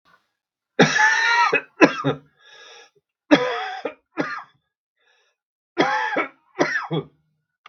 {"three_cough_length": "7.7 s", "three_cough_amplitude": 32768, "three_cough_signal_mean_std_ratio": 0.43, "survey_phase": "beta (2021-08-13 to 2022-03-07)", "age": "65+", "gender": "Male", "wearing_mask": "No", "symptom_cough_any": true, "symptom_new_continuous_cough": true, "symptom_sore_throat": true, "symptom_onset": "2 days", "smoker_status": "Ex-smoker", "respiratory_condition_asthma": false, "respiratory_condition_other": false, "recruitment_source": "Test and Trace", "submission_delay": "1 day", "covid_test_result": "Negative", "covid_test_method": "RT-qPCR"}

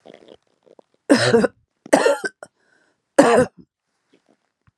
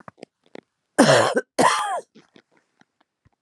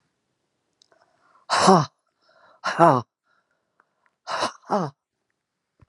{"three_cough_length": "4.8 s", "three_cough_amplitude": 32761, "three_cough_signal_mean_std_ratio": 0.35, "cough_length": "3.4 s", "cough_amplitude": 31062, "cough_signal_mean_std_ratio": 0.38, "exhalation_length": "5.9 s", "exhalation_amplitude": 31981, "exhalation_signal_mean_std_ratio": 0.28, "survey_phase": "beta (2021-08-13 to 2022-03-07)", "age": "65+", "gender": "Female", "wearing_mask": "No", "symptom_cough_any": true, "symptom_runny_or_blocked_nose": true, "symptom_sore_throat": true, "symptom_headache": true, "symptom_onset": "3 days", "smoker_status": "Never smoked", "respiratory_condition_asthma": false, "respiratory_condition_other": false, "recruitment_source": "Test and Trace", "submission_delay": "1 day", "covid_test_result": "Positive", "covid_test_method": "RT-qPCR", "covid_ct_value": 22.9, "covid_ct_gene": "ORF1ab gene", "covid_ct_mean": 24.3, "covid_viral_load": "11000 copies/ml", "covid_viral_load_category": "Low viral load (10K-1M copies/ml)"}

